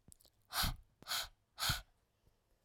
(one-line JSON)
{"exhalation_length": "2.6 s", "exhalation_amplitude": 2703, "exhalation_signal_mean_std_ratio": 0.41, "survey_phase": "alpha (2021-03-01 to 2021-08-12)", "age": "18-44", "gender": "Female", "wearing_mask": "No", "symptom_none": true, "symptom_onset": "13 days", "smoker_status": "Never smoked", "respiratory_condition_asthma": false, "respiratory_condition_other": false, "recruitment_source": "REACT", "submission_delay": "2 days", "covid_test_result": "Negative", "covid_test_method": "RT-qPCR"}